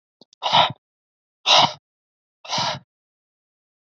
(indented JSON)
{
  "exhalation_length": "3.9 s",
  "exhalation_amplitude": 26427,
  "exhalation_signal_mean_std_ratio": 0.32,
  "survey_phase": "beta (2021-08-13 to 2022-03-07)",
  "age": "18-44",
  "gender": "Male",
  "wearing_mask": "No",
  "symptom_cough_any": true,
  "symptom_new_continuous_cough": true,
  "symptom_runny_or_blocked_nose": true,
  "symptom_fatigue": true,
  "symptom_fever_high_temperature": true,
  "symptom_headache": true,
  "symptom_other": true,
  "smoker_status": "Ex-smoker",
  "respiratory_condition_asthma": false,
  "respiratory_condition_other": false,
  "recruitment_source": "Test and Trace",
  "submission_delay": "2 days",
  "covid_test_result": "Positive",
  "covid_test_method": "RT-qPCR",
  "covid_ct_value": 23.7,
  "covid_ct_gene": "N gene"
}